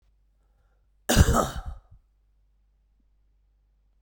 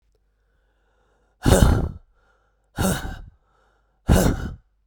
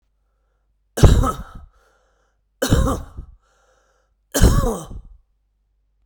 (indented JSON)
{
  "cough_length": "4.0 s",
  "cough_amplitude": 20207,
  "cough_signal_mean_std_ratio": 0.26,
  "exhalation_length": "4.9 s",
  "exhalation_amplitude": 32768,
  "exhalation_signal_mean_std_ratio": 0.37,
  "three_cough_length": "6.1 s",
  "three_cough_amplitude": 32768,
  "three_cough_signal_mean_std_ratio": 0.34,
  "survey_phase": "beta (2021-08-13 to 2022-03-07)",
  "age": "45-64",
  "gender": "Male",
  "wearing_mask": "No",
  "symptom_new_continuous_cough": true,
  "symptom_runny_or_blocked_nose": true,
  "symptom_fatigue": true,
  "symptom_fever_high_temperature": true,
  "symptom_headache": true,
  "symptom_change_to_sense_of_smell_or_taste": true,
  "symptom_onset": "4 days",
  "smoker_status": "Current smoker (e-cigarettes or vapes only)",
  "respiratory_condition_asthma": false,
  "respiratory_condition_other": false,
  "recruitment_source": "Test and Trace",
  "submission_delay": "2 days",
  "covid_test_result": "Positive",
  "covid_test_method": "RT-qPCR",
  "covid_ct_value": 16.5,
  "covid_ct_gene": "ORF1ab gene",
  "covid_ct_mean": 16.8,
  "covid_viral_load": "3200000 copies/ml",
  "covid_viral_load_category": "High viral load (>1M copies/ml)"
}